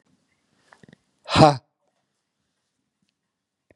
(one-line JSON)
{"exhalation_length": "3.8 s", "exhalation_amplitude": 32767, "exhalation_signal_mean_std_ratio": 0.18, "survey_phase": "beta (2021-08-13 to 2022-03-07)", "age": "65+", "gender": "Male", "wearing_mask": "No", "symptom_none": true, "smoker_status": "Ex-smoker", "respiratory_condition_asthma": false, "respiratory_condition_other": false, "recruitment_source": "REACT", "submission_delay": "5 days", "covid_test_result": "Negative", "covid_test_method": "RT-qPCR", "influenza_a_test_result": "Negative", "influenza_b_test_result": "Negative"}